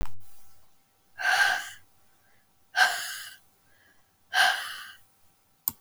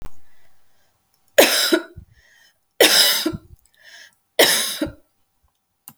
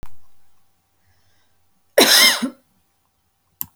exhalation_length: 5.8 s
exhalation_amplitude: 14551
exhalation_signal_mean_std_ratio: 0.45
three_cough_length: 6.0 s
three_cough_amplitude: 31118
three_cough_signal_mean_std_ratio: 0.4
cough_length: 3.8 s
cough_amplitude: 32768
cough_signal_mean_std_ratio: 0.33
survey_phase: beta (2021-08-13 to 2022-03-07)
age: 45-64
gender: Female
wearing_mask: 'No'
symptom_headache: true
symptom_onset: 3 days
smoker_status: Never smoked
respiratory_condition_asthma: false
respiratory_condition_other: false
recruitment_source: REACT
submission_delay: 1 day
covid_test_result: Negative
covid_test_method: RT-qPCR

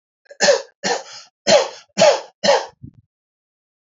cough_length: 3.8 s
cough_amplitude: 29075
cough_signal_mean_std_ratio: 0.41
survey_phase: alpha (2021-03-01 to 2021-08-12)
age: 45-64
gender: Male
wearing_mask: 'No'
symptom_none: true
smoker_status: Ex-smoker
respiratory_condition_asthma: false
respiratory_condition_other: false
recruitment_source: REACT
submission_delay: 2 days
covid_test_result: Negative
covid_test_method: RT-qPCR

